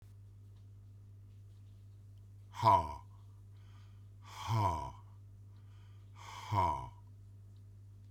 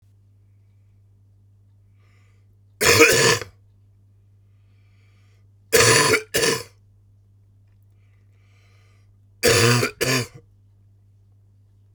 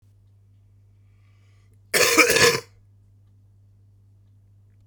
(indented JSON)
{
  "exhalation_length": "8.1 s",
  "exhalation_amplitude": 5650,
  "exhalation_signal_mean_std_ratio": 0.43,
  "three_cough_length": "11.9 s",
  "three_cough_amplitude": 32767,
  "three_cough_signal_mean_std_ratio": 0.35,
  "cough_length": "4.9 s",
  "cough_amplitude": 31530,
  "cough_signal_mean_std_ratio": 0.31,
  "survey_phase": "beta (2021-08-13 to 2022-03-07)",
  "age": "65+",
  "gender": "Male",
  "wearing_mask": "No",
  "symptom_cough_any": true,
  "symptom_onset": "4 days",
  "smoker_status": "Never smoked",
  "respiratory_condition_asthma": false,
  "respiratory_condition_other": false,
  "recruitment_source": "REACT",
  "submission_delay": "1 day",
  "covid_test_result": "Negative",
  "covid_test_method": "RT-qPCR"
}